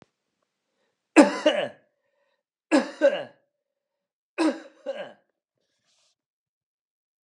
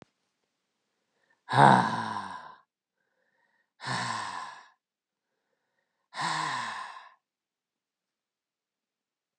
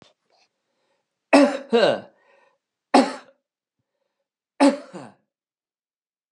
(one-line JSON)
{"cough_length": "7.2 s", "cough_amplitude": 28115, "cough_signal_mean_std_ratio": 0.26, "exhalation_length": "9.4 s", "exhalation_amplitude": 19428, "exhalation_signal_mean_std_ratio": 0.28, "three_cough_length": "6.3 s", "three_cough_amplitude": 27533, "three_cough_signal_mean_std_ratio": 0.28, "survey_phase": "alpha (2021-03-01 to 2021-08-12)", "age": "65+", "gender": "Male", "wearing_mask": "No", "symptom_none": true, "smoker_status": "Never smoked", "respiratory_condition_asthma": false, "respiratory_condition_other": false, "recruitment_source": "REACT", "submission_delay": "1 day", "covid_test_result": "Negative", "covid_test_method": "RT-qPCR"}